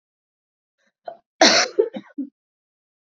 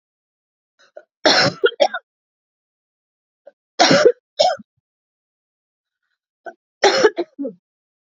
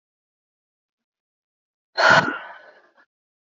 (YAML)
cough_length: 3.2 s
cough_amplitude: 29160
cough_signal_mean_std_ratio: 0.28
three_cough_length: 8.1 s
three_cough_amplitude: 29893
three_cough_signal_mean_std_ratio: 0.32
exhalation_length: 3.6 s
exhalation_amplitude: 27039
exhalation_signal_mean_std_ratio: 0.25
survey_phase: beta (2021-08-13 to 2022-03-07)
age: 18-44
gender: Female
wearing_mask: 'No'
symptom_cough_any: true
symptom_runny_or_blocked_nose: true
symptom_diarrhoea: true
symptom_fatigue: true
symptom_change_to_sense_of_smell_or_taste: true
symptom_loss_of_taste: true
symptom_onset: 3 days
smoker_status: Never smoked
respiratory_condition_asthma: false
respiratory_condition_other: false
recruitment_source: Test and Trace
submission_delay: 1 day
covid_test_result: Positive
covid_test_method: RT-qPCR